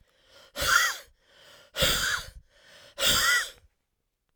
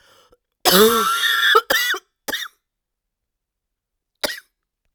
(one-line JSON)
{"exhalation_length": "4.4 s", "exhalation_amplitude": 13590, "exhalation_signal_mean_std_ratio": 0.47, "cough_length": "4.9 s", "cough_amplitude": 32768, "cough_signal_mean_std_ratio": 0.43, "survey_phase": "beta (2021-08-13 to 2022-03-07)", "age": "45-64", "gender": "Female", "wearing_mask": "No", "symptom_cough_any": true, "symptom_runny_or_blocked_nose": true, "symptom_fever_high_temperature": true, "symptom_headache": true, "symptom_change_to_sense_of_smell_or_taste": true, "symptom_loss_of_taste": true, "symptom_onset": "3 days", "smoker_status": "Ex-smoker", "respiratory_condition_asthma": false, "respiratory_condition_other": false, "recruitment_source": "Test and Trace", "submission_delay": "2 days", "covid_test_result": "Positive", "covid_test_method": "RT-qPCR", "covid_ct_value": 15.5, "covid_ct_gene": "ORF1ab gene"}